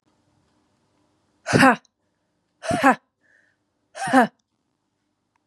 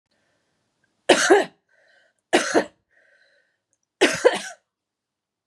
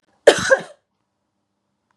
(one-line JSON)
{"exhalation_length": "5.5 s", "exhalation_amplitude": 29594, "exhalation_signal_mean_std_ratio": 0.27, "three_cough_length": "5.5 s", "three_cough_amplitude": 29775, "three_cough_signal_mean_std_ratio": 0.3, "cough_length": "2.0 s", "cough_amplitude": 32768, "cough_signal_mean_std_ratio": 0.24, "survey_phase": "beta (2021-08-13 to 2022-03-07)", "age": "45-64", "gender": "Female", "wearing_mask": "No", "symptom_cough_any": true, "symptom_runny_or_blocked_nose": true, "symptom_sore_throat": true, "symptom_fatigue": true, "symptom_headache": true, "symptom_other": true, "symptom_onset": "2 days", "smoker_status": "Never smoked", "respiratory_condition_asthma": true, "respiratory_condition_other": false, "recruitment_source": "Test and Trace", "submission_delay": "2 days", "covid_test_result": "Positive", "covid_test_method": "ePCR"}